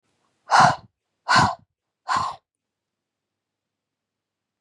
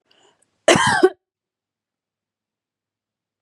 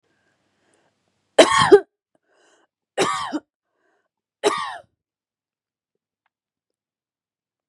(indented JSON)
{
  "exhalation_length": "4.6 s",
  "exhalation_amplitude": 28321,
  "exhalation_signal_mean_std_ratio": 0.3,
  "cough_length": "3.4 s",
  "cough_amplitude": 29532,
  "cough_signal_mean_std_ratio": 0.26,
  "three_cough_length": "7.7 s",
  "three_cough_amplitude": 32395,
  "three_cough_signal_mean_std_ratio": 0.23,
  "survey_phase": "beta (2021-08-13 to 2022-03-07)",
  "age": "18-44",
  "gender": "Female",
  "wearing_mask": "No",
  "symptom_none": true,
  "smoker_status": "Never smoked",
  "respiratory_condition_asthma": false,
  "respiratory_condition_other": false,
  "recruitment_source": "REACT",
  "submission_delay": "3 days",
  "covid_test_result": "Negative",
  "covid_test_method": "RT-qPCR",
  "influenza_a_test_result": "Negative",
  "influenza_b_test_result": "Negative"
}